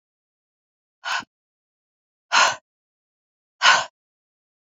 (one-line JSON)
{"exhalation_length": "4.8 s", "exhalation_amplitude": 32767, "exhalation_signal_mean_std_ratio": 0.25, "survey_phase": "alpha (2021-03-01 to 2021-08-12)", "age": "45-64", "gender": "Female", "wearing_mask": "No", "symptom_none": true, "smoker_status": "Never smoked", "respiratory_condition_asthma": false, "respiratory_condition_other": false, "recruitment_source": "REACT", "submission_delay": "1 day", "covid_test_result": "Negative", "covid_test_method": "RT-qPCR", "covid_ct_value": 41.0, "covid_ct_gene": "N gene"}